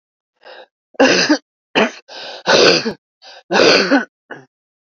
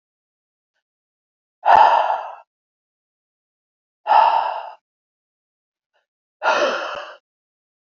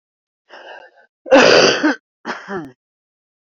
{"three_cough_length": "4.9 s", "three_cough_amplitude": 30017, "three_cough_signal_mean_std_ratio": 0.47, "exhalation_length": "7.9 s", "exhalation_amplitude": 32767, "exhalation_signal_mean_std_ratio": 0.34, "cough_length": "3.6 s", "cough_amplitude": 32768, "cough_signal_mean_std_ratio": 0.37, "survey_phase": "beta (2021-08-13 to 2022-03-07)", "age": "45-64", "gender": "Female", "wearing_mask": "No", "symptom_cough_any": true, "symptom_runny_or_blocked_nose": true, "symptom_fatigue": true, "symptom_fever_high_temperature": true, "symptom_headache": true, "symptom_onset": "1 day", "smoker_status": "Ex-smoker", "respiratory_condition_asthma": false, "respiratory_condition_other": false, "recruitment_source": "Test and Trace", "submission_delay": "1 day", "covid_test_result": "Positive", "covid_test_method": "RT-qPCR"}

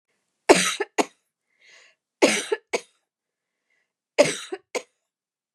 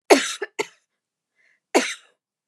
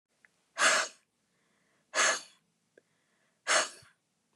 {"three_cough_length": "5.5 s", "three_cough_amplitude": 32767, "three_cough_signal_mean_std_ratio": 0.27, "cough_length": "2.5 s", "cough_amplitude": 31966, "cough_signal_mean_std_ratio": 0.28, "exhalation_length": "4.4 s", "exhalation_amplitude": 9322, "exhalation_signal_mean_std_ratio": 0.33, "survey_phase": "beta (2021-08-13 to 2022-03-07)", "age": "45-64", "gender": "Female", "wearing_mask": "No", "symptom_none": true, "smoker_status": "Never smoked", "respiratory_condition_asthma": false, "respiratory_condition_other": false, "recruitment_source": "REACT", "submission_delay": "2 days", "covid_test_result": "Negative", "covid_test_method": "RT-qPCR", "influenza_a_test_result": "Negative", "influenza_b_test_result": "Negative"}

